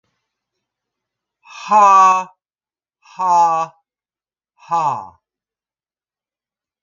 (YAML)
exhalation_length: 6.8 s
exhalation_amplitude: 30828
exhalation_signal_mean_std_ratio: 0.35
survey_phase: beta (2021-08-13 to 2022-03-07)
age: 65+
gender: Female
wearing_mask: 'No'
symptom_none: true
smoker_status: Never smoked
respiratory_condition_asthma: false
respiratory_condition_other: false
recruitment_source: REACT
submission_delay: 1 day
covid_test_result: Negative
covid_test_method: RT-qPCR